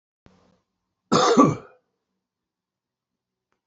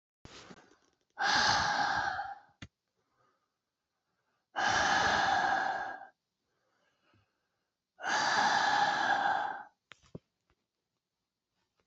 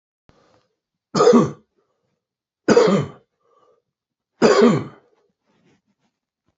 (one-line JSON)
{"cough_length": "3.7 s", "cough_amplitude": 24045, "cough_signal_mean_std_ratio": 0.28, "exhalation_length": "11.9 s", "exhalation_amplitude": 5489, "exhalation_signal_mean_std_ratio": 0.52, "three_cough_length": "6.6 s", "three_cough_amplitude": 27284, "three_cough_signal_mean_std_ratio": 0.34, "survey_phase": "beta (2021-08-13 to 2022-03-07)", "age": "45-64", "gender": "Male", "wearing_mask": "No", "symptom_none": true, "smoker_status": "Current smoker (11 or more cigarettes per day)", "respiratory_condition_asthma": false, "respiratory_condition_other": false, "recruitment_source": "REACT", "submission_delay": "2 days", "covid_test_result": "Negative", "covid_test_method": "RT-qPCR", "influenza_a_test_result": "Negative", "influenza_b_test_result": "Negative"}